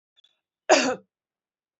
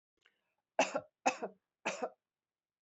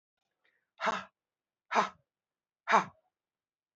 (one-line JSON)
{"cough_length": "1.8 s", "cough_amplitude": 20984, "cough_signal_mean_std_ratio": 0.27, "three_cough_length": "2.8 s", "three_cough_amplitude": 6029, "three_cough_signal_mean_std_ratio": 0.29, "exhalation_length": "3.8 s", "exhalation_amplitude": 10725, "exhalation_signal_mean_std_ratio": 0.26, "survey_phase": "beta (2021-08-13 to 2022-03-07)", "age": "65+", "gender": "Female", "wearing_mask": "No", "symptom_cough_any": true, "symptom_runny_or_blocked_nose": true, "symptom_abdominal_pain": true, "symptom_fatigue": true, "symptom_change_to_sense_of_smell_or_taste": true, "smoker_status": "Never smoked", "respiratory_condition_asthma": false, "respiratory_condition_other": false, "recruitment_source": "Test and Trace", "submission_delay": "2 days", "covid_test_result": "Positive", "covid_test_method": "LFT"}